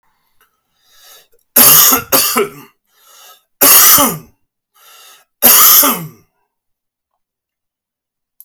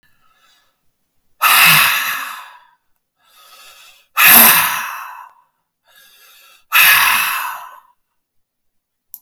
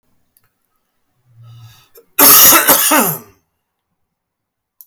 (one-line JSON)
{"three_cough_length": "8.4 s", "three_cough_amplitude": 32768, "three_cough_signal_mean_std_ratio": 0.41, "exhalation_length": "9.2 s", "exhalation_amplitude": 32768, "exhalation_signal_mean_std_ratio": 0.41, "cough_length": "4.9 s", "cough_amplitude": 32768, "cough_signal_mean_std_ratio": 0.37, "survey_phase": "alpha (2021-03-01 to 2021-08-12)", "age": "45-64", "gender": "Male", "wearing_mask": "No", "symptom_none": true, "smoker_status": "Current smoker (1 to 10 cigarettes per day)", "respiratory_condition_asthma": false, "respiratory_condition_other": false, "recruitment_source": "REACT", "submission_delay": "7 days", "covid_test_result": "Negative", "covid_test_method": "RT-qPCR"}